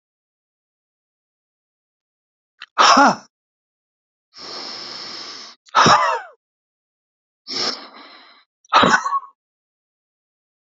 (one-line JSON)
{"exhalation_length": "10.7 s", "exhalation_amplitude": 30304, "exhalation_signal_mean_std_ratio": 0.31, "survey_phase": "beta (2021-08-13 to 2022-03-07)", "age": "65+", "gender": "Male", "wearing_mask": "No", "symptom_cough_any": true, "symptom_headache": true, "smoker_status": "Ex-smoker", "respiratory_condition_asthma": false, "respiratory_condition_other": false, "recruitment_source": "REACT", "submission_delay": "1 day", "covid_test_result": "Negative", "covid_test_method": "RT-qPCR", "influenza_a_test_result": "Negative", "influenza_b_test_result": "Negative"}